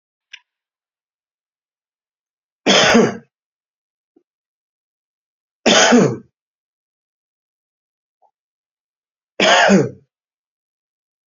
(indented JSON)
{
  "three_cough_length": "11.3 s",
  "three_cough_amplitude": 32768,
  "three_cough_signal_mean_std_ratio": 0.29,
  "survey_phase": "beta (2021-08-13 to 2022-03-07)",
  "age": "45-64",
  "gender": "Male",
  "wearing_mask": "No",
  "symptom_new_continuous_cough": true,
  "symptom_fatigue": true,
  "symptom_headache": true,
  "smoker_status": "Ex-smoker",
  "respiratory_condition_asthma": false,
  "respiratory_condition_other": false,
  "recruitment_source": "Test and Trace",
  "submission_delay": "2 days",
  "covid_test_result": "Positive",
  "covid_test_method": "ePCR"
}